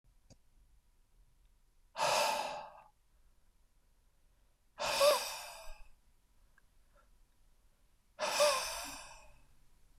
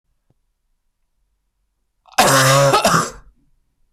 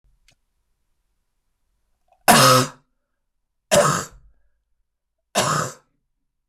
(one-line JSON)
{"exhalation_length": "10.0 s", "exhalation_amplitude": 4687, "exhalation_signal_mean_std_ratio": 0.37, "cough_length": "3.9 s", "cough_amplitude": 26002, "cough_signal_mean_std_ratio": 0.41, "three_cough_length": "6.5 s", "three_cough_amplitude": 26028, "three_cough_signal_mean_std_ratio": 0.31, "survey_phase": "beta (2021-08-13 to 2022-03-07)", "age": "45-64", "gender": "Male", "wearing_mask": "No", "symptom_none": true, "smoker_status": "Never smoked", "respiratory_condition_asthma": false, "respiratory_condition_other": false, "recruitment_source": "REACT", "submission_delay": "1 day", "covid_test_result": "Negative", "covid_test_method": "RT-qPCR"}